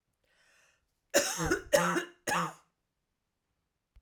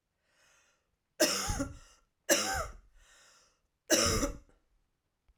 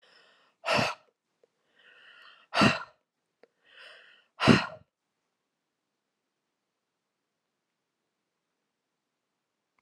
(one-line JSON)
{"cough_length": "4.0 s", "cough_amplitude": 9829, "cough_signal_mean_std_ratio": 0.38, "three_cough_length": "5.4 s", "three_cough_amplitude": 9319, "three_cough_signal_mean_std_ratio": 0.39, "exhalation_length": "9.8 s", "exhalation_amplitude": 19063, "exhalation_signal_mean_std_ratio": 0.21, "survey_phase": "alpha (2021-03-01 to 2021-08-12)", "age": "45-64", "gender": "Female", "wearing_mask": "No", "symptom_cough_any": true, "symptom_fatigue": true, "symptom_onset": "13 days", "smoker_status": "Never smoked", "respiratory_condition_asthma": false, "respiratory_condition_other": false, "recruitment_source": "REACT", "submission_delay": "1 day", "covid_test_result": "Negative", "covid_test_method": "RT-qPCR"}